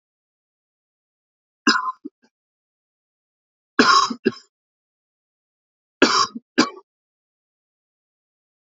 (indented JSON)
{
  "three_cough_length": "8.7 s",
  "three_cough_amplitude": 30638,
  "three_cough_signal_mean_std_ratio": 0.25,
  "survey_phase": "beta (2021-08-13 to 2022-03-07)",
  "age": "18-44",
  "gender": "Male",
  "wearing_mask": "No",
  "symptom_none": true,
  "smoker_status": "Never smoked",
  "respiratory_condition_asthma": false,
  "respiratory_condition_other": false,
  "recruitment_source": "REACT",
  "submission_delay": "1 day",
  "covid_test_result": "Negative",
  "covid_test_method": "RT-qPCR",
  "influenza_a_test_result": "Negative",
  "influenza_b_test_result": "Negative"
}